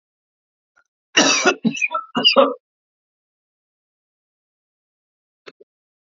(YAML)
three_cough_length: 6.1 s
three_cough_amplitude: 29335
three_cough_signal_mean_std_ratio: 0.3
survey_phase: beta (2021-08-13 to 2022-03-07)
age: 18-44
gender: Male
wearing_mask: 'No'
symptom_none: true
smoker_status: Never smoked
respiratory_condition_asthma: false
respiratory_condition_other: false
recruitment_source: REACT
submission_delay: 1 day
covid_test_result: Negative
covid_test_method: RT-qPCR